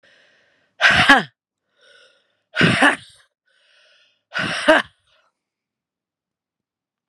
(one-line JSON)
{"exhalation_length": "7.1 s", "exhalation_amplitude": 32767, "exhalation_signal_mean_std_ratio": 0.31, "survey_phase": "beta (2021-08-13 to 2022-03-07)", "age": "18-44", "gender": "Female", "wearing_mask": "No", "symptom_cough_any": true, "symptom_shortness_of_breath": true, "symptom_diarrhoea": true, "symptom_fatigue": true, "symptom_other": true, "symptom_onset": "3 days", "smoker_status": "Never smoked", "respiratory_condition_asthma": false, "respiratory_condition_other": false, "recruitment_source": "Test and Trace", "submission_delay": "2 days", "covid_test_result": "Positive", "covid_test_method": "RT-qPCR", "covid_ct_value": 19.1, "covid_ct_gene": "ORF1ab gene", "covid_ct_mean": 19.8, "covid_viral_load": "330000 copies/ml", "covid_viral_load_category": "Low viral load (10K-1M copies/ml)"}